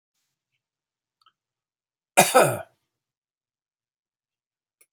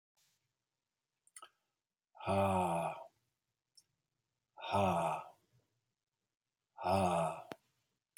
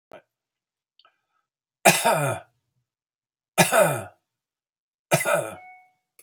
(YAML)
cough_length: 4.9 s
cough_amplitude: 32767
cough_signal_mean_std_ratio: 0.19
exhalation_length: 8.2 s
exhalation_amplitude: 3235
exhalation_signal_mean_std_ratio: 0.41
three_cough_length: 6.2 s
three_cough_amplitude: 29248
three_cough_signal_mean_std_ratio: 0.34
survey_phase: beta (2021-08-13 to 2022-03-07)
age: 65+
gender: Male
wearing_mask: 'No'
symptom_cough_any: true
smoker_status: Never smoked
respiratory_condition_asthma: false
respiratory_condition_other: false
recruitment_source: REACT
submission_delay: 1 day
covid_test_result: Negative
covid_test_method: RT-qPCR